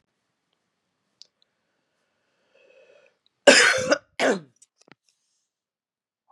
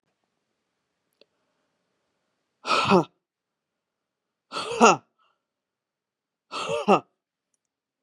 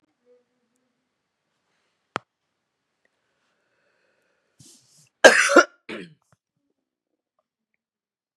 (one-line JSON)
{"three_cough_length": "6.3 s", "three_cough_amplitude": 32318, "three_cough_signal_mean_std_ratio": 0.23, "exhalation_length": "8.0 s", "exhalation_amplitude": 29115, "exhalation_signal_mean_std_ratio": 0.24, "cough_length": "8.4 s", "cough_amplitude": 32768, "cough_signal_mean_std_ratio": 0.15, "survey_phase": "beta (2021-08-13 to 2022-03-07)", "age": "45-64", "gender": "Female", "wearing_mask": "No", "symptom_cough_any": true, "symptom_runny_or_blocked_nose": true, "symptom_sore_throat": true, "symptom_fatigue": true, "symptom_headache": true, "smoker_status": "Never smoked", "respiratory_condition_asthma": false, "respiratory_condition_other": false, "recruitment_source": "Test and Trace", "submission_delay": "1 day", "covid_test_result": "Positive", "covid_test_method": "RT-qPCR", "covid_ct_value": 27.1, "covid_ct_gene": "ORF1ab gene", "covid_ct_mean": 27.3, "covid_viral_load": "1100 copies/ml", "covid_viral_load_category": "Minimal viral load (< 10K copies/ml)"}